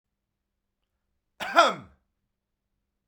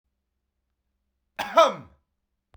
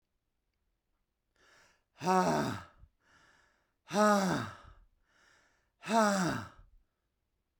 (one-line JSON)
{"cough_length": "3.1 s", "cough_amplitude": 19576, "cough_signal_mean_std_ratio": 0.21, "three_cough_length": "2.6 s", "three_cough_amplitude": 20223, "three_cough_signal_mean_std_ratio": 0.22, "exhalation_length": "7.6 s", "exhalation_amplitude": 6255, "exhalation_signal_mean_std_ratio": 0.37, "survey_phase": "beta (2021-08-13 to 2022-03-07)", "age": "18-44", "gender": "Male", "wearing_mask": "No", "symptom_fatigue": true, "symptom_headache": true, "symptom_change_to_sense_of_smell_or_taste": true, "smoker_status": "Never smoked", "respiratory_condition_asthma": false, "respiratory_condition_other": false, "recruitment_source": "Test and Trace", "submission_delay": "2 days", "covid_test_result": "Positive", "covid_test_method": "RT-qPCR", "covid_ct_value": 27.1, "covid_ct_gene": "ORF1ab gene", "covid_ct_mean": 28.3, "covid_viral_load": "530 copies/ml", "covid_viral_load_category": "Minimal viral load (< 10K copies/ml)"}